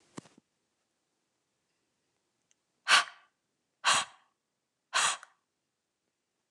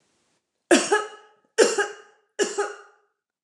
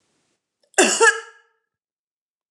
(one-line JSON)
{"exhalation_length": "6.5 s", "exhalation_amplitude": 13003, "exhalation_signal_mean_std_ratio": 0.23, "three_cough_length": "3.4 s", "three_cough_amplitude": 25277, "three_cough_signal_mean_std_ratio": 0.37, "cough_length": "2.5 s", "cough_amplitude": 29203, "cough_signal_mean_std_ratio": 0.3, "survey_phase": "beta (2021-08-13 to 2022-03-07)", "age": "18-44", "gender": "Female", "wearing_mask": "No", "symptom_runny_or_blocked_nose": true, "symptom_sore_throat": true, "symptom_fatigue": true, "symptom_onset": "6 days", "smoker_status": "Ex-smoker", "respiratory_condition_asthma": false, "respiratory_condition_other": false, "recruitment_source": "Test and Trace", "submission_delay": "2 days", "covid_test_result": "Positive", "covid_test_method": "RT-qPCR", "covid_ct_value": 16.6, "covid_ct_gene": "ORF1ab gene", "covid_ct_mean": 16.8, "covid_viral_load": "3000000 copies/ml", "covid_viral_load_category": "High viral load (>1M copies/ml)"}